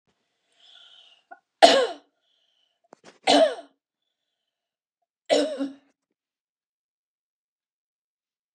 {"three_cough_length": "8.5 s", "three_cough_amplitude": 31673, "three_cough_signal_mean_std_ratio": 0.23, "survey_phase": "beta (2021-08-13 to 2022-03-07)", "age": "65+", "gender": "Female", "wearing_mask": "No", "symptom_runny_or_blocked_nose": true, "symptom_onset": "8 days", "smoker_status": "Never smoked", "respiratory_condition_asthma": false, "respiratory_condition_other": false, "recruitment_source": "REACT", "submission_delay": "3 days", "covid_test_result": "Negative", "covid_test_method": "RT-qPCR", "influenza_a_test_result": "Negative", "influenza_b_test_result": "Negative"}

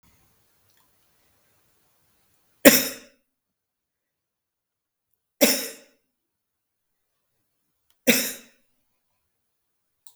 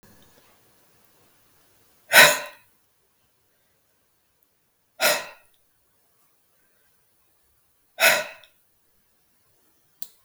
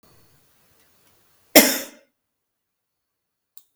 {"three_cough_length": "10.2 s", "three_cough_amplitude": 32767, "three_cough_signal_mean_std_ratio": 0.18, "exhalation_length": "10.2 s", "exhalation_amplitude": 32768, "exhalation_signal_mean_std_ratio": 0.2, "cough_length": "3.8 s", "cough_amplitude": 32768, "cough_signal_mean_std_ratio": 0.18, "survey_phase": "beta (2021-08-13 to 2022-03-07)", "age": "65+", "gender": "Female", "wearing_mask": "No", "symptom_none": true, "smoker_status": "Ex-smoker", "respiratory_condition_asthma": false, "respiratory_condition_other": false, "recruitment_source": "REACT", "submission_delay": "1 day", "covid_test_result": "Negative", "covid_test_method": "RT-qPCR", "influenza_a_test_result": "Negative", "influenza_b_test_result": "Negative"}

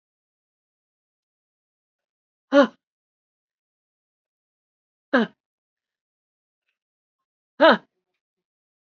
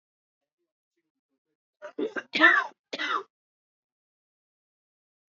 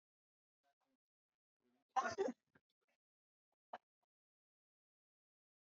{"exhalation_length": "9.0 s", "exhalation_amplitude": 26893, "exhalation_signal_mean_std_ratio": 0.16, "three_cough_length": "5.4 s", "three_cough_amplitude": 16347, "three_cough_signal_mean_std_ratio": 0.25, "cough_length": "5.7 s", "cough_amplitude": 1997, "cough_signal_mean_std_ratio": 0.18, "survey_phase": "beta (2021-08-13 to 2022-03-07)", "age": "45-64", "gender": "Female", "wearing_mask": "No", "symptom_cough_any": true, "symptom_runny_or_blocked_nose": true, "symptom_sore_throat": true, "symptom_fever_high_temperature": true, "symptom_headache": true, "symptom_onset": "4 days", "smoker_status": "Never smoked", "respiratory_condition_asthma": false, "respiratory_condition_other": false, "recruitment_source": "Test and Trace", "submission_delay": "3 days", "covid_test_result": "Positive", "covid_test_method": "RT-qPCR", "covid_ct_value": 21.0, "covid_ct_gene": "N gene", "covid_ct_mean": 21.8, "covid_viral_load": "69000 copies/ml", "covid_viral_load_category": "Low viral load (10K-1M copies/ml)"}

